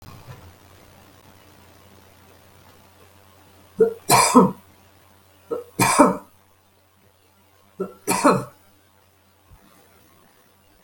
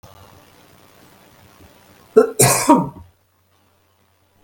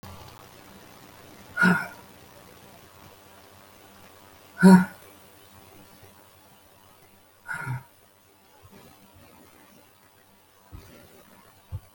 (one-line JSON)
{"three_cough_length": "10.8 s", "three_cough_amplitude": 32766, "three_cough_signal_mean_std_ratio": 0.29, "cough_length": "4.4 s", "cough_amplitude": 32768, "cough_signal_mean_std_ratio": 0.29, "exhalation_length": "11.9 s", "exhalation_amplitude": 23869, "exhalation_signal_mean_std_ratio": 0.22, "survey_phase": "beta (2021-08-13 to 2022-03-07)", "age": "65+", "gender": "Female", "wearing_mask": "No", "symptom_cough_any": true, "symptom_runny_or_blocked_nose": true, "smoker_status": "Never smoked", "respiratory_condition_asthma": false, "respiratory_condition_other": false, "recruitment_source": "Test and Trace", "submission_delay": "2 days", "covid_test_result": "Positive", "covid_test_method": "LFT"}